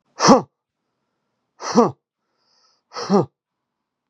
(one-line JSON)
{"exhalation_length": "4.1 s", "exhalation_amplitude": 32767, "exhalation_signal_mean_std_ratio": 0.28, "survey_phase": "beta (2021-08-13 to 2022-03-07)", "age": "18-44", "gender": "Male", "wearing_mask": "No", "symptom_sore_throat": true, "symptom_fatigue": true, "smoker_status": "Never smoked", "respiratory_condition_asthma": false, "respiratory_condition_other": false, "recruitment_source": "Test and Trace", "submission_delay": "0 days", "covid_test_result": "Positive", "covid_test_method": "RT-qPCR", "covid_ct_value": 16.9, "covid_ct_gene": "N gene"}